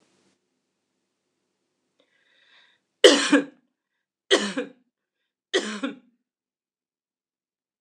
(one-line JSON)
{"three_cough_length": "7.8 s", "three_cough_amplitude": 26028, "three_cough_signal_mean_std_ratio": 0.22, "survey_phase": "alpha (2021-03-01 to 2021-08-12)", "age": "65+", "gender": "Female", "wearing_mask": "No", "symptom_none": true, "smoker_status": "Never smoked", "respiratory_condition_asthma": false, "respiratory_condition_other": false, "recruitment_source": "REACT", "submission_delay": "12 days", "covid_test_result": "Negative", "covid_test_method": "RT-qPCR"}